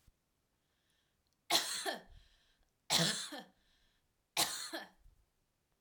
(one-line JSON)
{"three_cough_length": "5.8 s", "three_cough_amplitude": 6079, "three_cough_signal_mean_std_ratio": 0.35, "survey_phase": "alpha (2021-03-01 to 2021-08-12)", "age": "18-44", "gender": "Female", "wearing_mask": "No", "symptom_none": true, "smoker_status": "Never smoked", "respiratory_condition_asthma": false, "respiratory_condition_other": false, "recruitment_source": "REACT", "submission_delay": "2 days", "covid_test_result": "Negative", "covid_test_method": "RT-qPCR"}